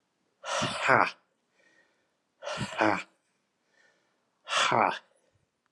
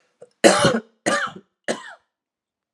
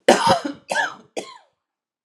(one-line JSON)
{"exhalation_length": "5.7 s", "exhalation_amplitude": 18964, "exhalation_signal_mean_std_ratio": 0.37, "three_cough_length": "2.7 s", "three_cough_amplitude": 32768, "three_cough_signal_mean_std_ratio": 0.36, "cough_length": "2.0 s", "cough_amplitude": 32767, "cough_signal_mean_std_ratio": 0.41, "survey_phase": "alpha (2021-03-01 to 2021-08-12)", "age": "18-44", "gender": "Male", "wearing_mask": "No", "symptom_cough_any": true, "symptom_fatigue": true, "symptom_fever_high_temperature": true, "symptom_headache": true, "symptom_change_to_sense_of_smell_or_taste": true, "symptom_loss_of_taste": true, "symptom_onset": "2 days", "smoker_status": "Ex-smoker", "respiratory_condition_asthma": false, "respiratory_condition_other": false, "recruitment_source": "Test and Trace", "submission_delay": "2 days", "covid_test_result": "Positive", "covid_test_method": "RT-qPCR", "covid_ct_value": 18.5, "covid_ct_gene": "ORF1ab gene", "covid_ct_mean": 19.5, "covid_viral_load": "390000 copies/ml", "covid_viral_load_category": "Low viral load (10K-1M copies/ml)"}